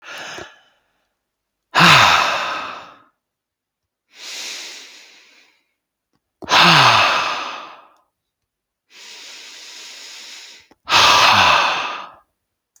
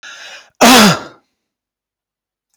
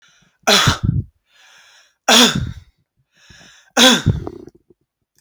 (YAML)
exhalation_length: 12.8 s
exhalation_amplitude: 32768
exhalation_signal_mean_std_ratio: 0.41
cough_length: 2.6 s
cough_amplitude: 32768
cough_signal_mean_std_ratio: 0.36
three_cough_length: 5.2 s
three_cough_amplitude: 31828
three_cough_signal_mean_std_ratio: 0.39
survey_phase: alpha (2021-03-01 to 2021-08-12)
age: 45-64
gender: Male
wearing_mask: 'No'
symptom_none: true
smoker_status: Never smoked
respiratory_condition_asthma: false
respiratory_condition_other: false
recruitment_source: REACT
submission_delay: 1 day
covid_test_result: Negative
covid_test_method: RT-qPCR